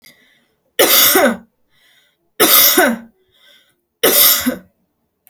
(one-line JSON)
{"three_cough_length": "5.3 s", "three_cough_amplitude": 32768, "three_cough_signal_mean_std_ratio": 0.47, "survey_phase": "beta (2021-08-13 to 2022-03-07)", "age": "18-44", "gender": "Female", "wearing_mask": "No", "symptom_none": true, "smoker_status": "Never smoked", "respiratory_condition_asthma": false, "respiratory_condition_other": false, "recruitment_source": "REACT", "submission_delay": "1 day", "covid_test_result": "Negative", "covid_test_method": "RT-qPCR"}